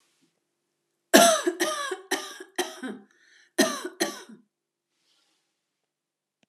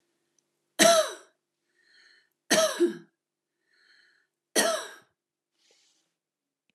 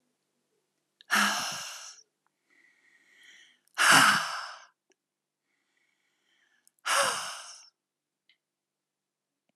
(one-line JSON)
{"cough_length": "6.5 s", "cough_amplitude": 31743, "cough_signal_mean_std_ratio": 0.31, "three_cough_length": "6.7 s", "three_cough_amplitude": 19586, "three_cough_signal_mean_std_ratio": 0.29, "exhalation_length": "9.6 s", "exhalation_amplitude": 16813, "exhalation_signal_mean_std_ratio": 0.3, "survey_phase": "alpha (2021-03-01 to 2021-08-12)", "age": "45-64", "gender": "Female", "wearing_mask": "No", "symptom_none": true, "smoker_status": "Never smoked", "respiratory_condition_asthma": true, "respiratory_condition_other": false, "recruitment_source": "REACT", "submission_delay": "1 day", "covid_test_result": "Negative", "covid_test_method": "RT-qPCR"}